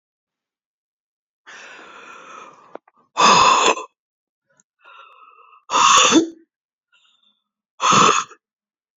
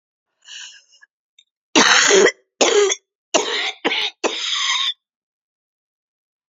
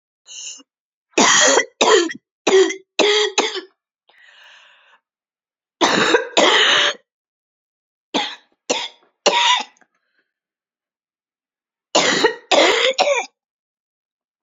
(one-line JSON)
{"exhalation_length": "9.0 s", "exhalation_amplitude": 29643, "exhalation_signal_mean_std_ratio": 0.36, "cough_length": "6.5 s", "cough_amplitude": 31004, "cough_signal_mean_std_ratio": 0.46, "three_cough_length": "14.4 s", "three_cough_amplitude": 32767, "three_cough_signal_mean_std_ratio": 0.45, "survey_phase": "beta (2021-08-13 to 2022-03-07)", "age": "45-64", "gender": "Female", "wearing_mask": "No", "symptom_cough_any": true, "symptom_shortness_of_breath": true, "symptom_sore_throat": true, "symptom_fatigue": true, "symptom_onset": "12 days", "smoker_status": "Never smoked", "respiratory_condition_asthma": true, "respiratory_condition_other": false, "recruitment_source": "REACT", "submission_delay": "1 day", "covid_test_result": "Negative", "covid_test_method": "RT-qPCR"}